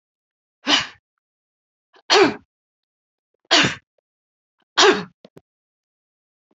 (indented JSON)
{
  "three_cough_length": "6.6 s",
  "three_cough_amplitude": 30576,
  "three_cough_signal_mean_std_ratio": 0.28,
  "survey_phase": "alpha (2021-03-01 to 2021-08-12)",
  "age": "65+",
  "gender": "Female",
  "wearing_mask": "No",
  "symptom_none": true,
  "smoker_status": "Never smoked",
  "respiratory_condition_asthma": false,
  "respiratory_condition_other": false,
  "recruitment_source": "REACT",
  "submission_delay": "3 days",
  "covid_test_result": "Negative",
  "covid_test_method": "RT-qPCR"
}